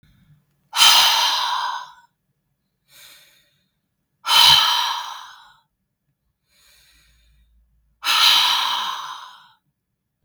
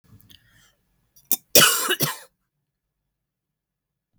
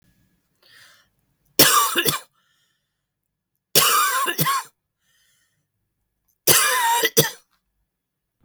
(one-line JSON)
{"exhalation_length": "10.2 s", "exhalation_amplitude": 32766, "exhalation_signal_mean_std_ratio": 0.41, "cough_length": "4.2 s", "cough_amplitude": 32768, "cough_signal_mean_std_ratio": 0.26, "three_cough_length": "8.4 s", "three_cough_amplitude": 32768, "three_cough_signal_mean_std_ratio": 0.4, "survey_phase": "beta (2021-08-13 to 2022-03-07)", "age": "45-64", "gender": "Female", "wearing_mask": "No", "symptom_cough_any": true, "symptom_shortness_of_breath": true, "symptom_fatigue": true, "symptom_headache": true, "smoker_status": "Never smoked", "respiratory_condition_asthma": false, "respiratory_condition_other": false, "recruitment_source": "REACT", "submission_delay": "2 days", "covid_test_result": "Negative", "covid_test_method": "RT-qPCR", "influenza_a_test_result": "Negative", "influenza_b_test_result": "Negative"}